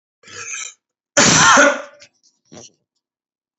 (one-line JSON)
{"cough_length": "3.6 s", "cough_amplitude": 32768, "cough_signal_mean_std_ratio": 0.38, "survey_phase": "beta (2021-08-13 to 2022-03-07)", "age": "45-64", "gender": "Male", "wearing_mask": "No", "symptom_none": true, "smoker_status": "Ex-smoker", "respiratory_condition_asthma": false, "respiratory_condition_other": false, "recruitment_source": "REACT", "submission_delay": "2 days", "covid_test_result": "Negative", "covid_test_method": "RT-qPCR", "influenza_a_test_result": "Negative", "influenza_b_test_result": "Negative"}